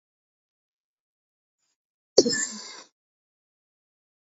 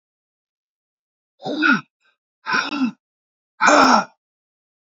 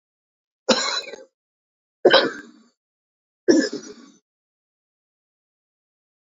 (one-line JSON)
{"cough_length": "4.3 s", "cough_amplitude": 30881, "cough_signal_mean_std_ratio": 0.18, "exhalation_length": "4.9 s", "exhalation_amplitude": 28169, "exhalation_signal_mean_std_ratio": 0.37, "three_cough_length": "6.3 s", "three_cough_amplitude": 27354, "three_cough_signal_mean_std_ratio": 0.27, "survey_phase": "beta (2021-08-13 to 2022-03-07)", "age": "45-64", "gender": "Male", "wearing_mask": "No", "symptom_cough_any": true, "symptom_runny_or_blocked_nose": true, "symptom_shortness_of_breath": true, "symptom_fatigue": true, "symptom_change_to_sense_of_smell_or_taste": true, "symptom_loss_of_taste": true, "symptom_onset": "2 days", "smoker_status": "Ex-smoker", "respiratory_condition_asthma": false, "respiratory_condition_other": true, "recruitment_source": "Test and Trace", "submission_delay": "1 day", "covid_test_result": "Positive", "covid_test_method": "RT-qPCR", "covid_ct_value": 21.2, "covid_ct_gene": "N gene"}